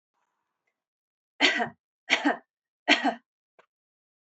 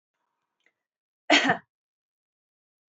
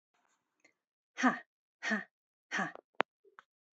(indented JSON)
{
  "three_cough_length": "4.3 s",
  "three_cough_amplitude": 17344,
  "three_cough_signal_mean_std_ratio": 0.3,
  "cough_length": "2.9 s",
  "cough_amplitude": 16360,
  "cough_signal_mean_std_ratio": 0.22,
  "exhalation_length": "3.8 s",
  "exhalation_amplitude": 12280,
  "exhalation_signal_mean_std_ratio": 0.27,
  "survey_phase": "beta (2021-08-13 to 2022-03-07)",
  "age": "18-44",
  "gender": "Female",
  "wearing_mask": "No",
  "symptom_none": true,
  "smoker_status": "Never smoked",
  "respiratory_condition_asthma": false,
  "respiratory_condition_other": false,
  "recruitment_source": "REACT",
  "submission_delay": "2 days",
  "covid_test_result": "Negative",
  "covid_test_method": "RT-qPCR",
  "influenza_a_test_result": "Negative",
  "influenza_b_test_result": "Negative"
}